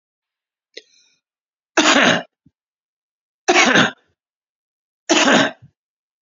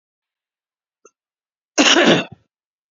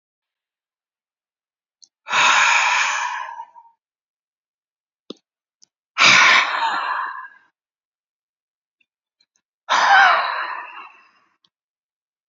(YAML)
three_cough_length: 6.2 s
three_cough_amplitude: 31932
three_cough_signal_mean_std_ratio: 0.36
cough_length: 2.9 s
cough_amplitude: 32115
cough_signal_mean_std_ratio: 0.31
exhalation_length: 12.3 s
exhalation_amplitude: 30706
exhalation_signal_mean_std_ratio: 0.39
survey_phase: beta (2021-08-13 to 2022-03-07)
age: 65+
gender: Male
wearing_mask: 'No'
symptom_none: true
smoker_status: Ex-smoker
respiratory_condition_asthma: true
respiratory_condition_other: false
recruitment_source: REACT
submission_delay: 5 days
covid_test_result: Negative
covid_test_method: RT-qPCR
influenza_a_test_result: Negative
influenza_b_test_result: Negative